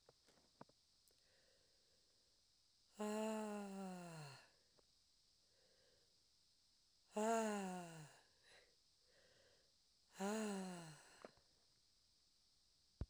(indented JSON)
{
  "exhalation_length": "13.1 s",
  "exhalation_amplitude": 1124,
  "exhalation_signal_mean_std_ratio": 0.4,
  "survey_phase": "beta (2021-08-13 to 2022-03-07)",
  "age": "18-44",
  "gender": "Female",
  "wearing_mask": "No",
  "symptom_cough_any": true,
  "symptom_runny_or_blocked_nose": true,
  "symptom_shortness_of_breath": true,
  "symptom_diarrhoea": true,
  "symptom_fatigue": true,
  "symptom_headache": true,
  "symptom_other": true,
  "smoker_status": "Never smoked",
  "respiratory_condition_asthma": false,
  "respiratory_condition_other": false,
  "recruitment_source": "Test and Trace",
  "submission_delay": "1 day",
  "covid_test_result": "Positive",
  "covid_test_method": "RT-qPCR"
}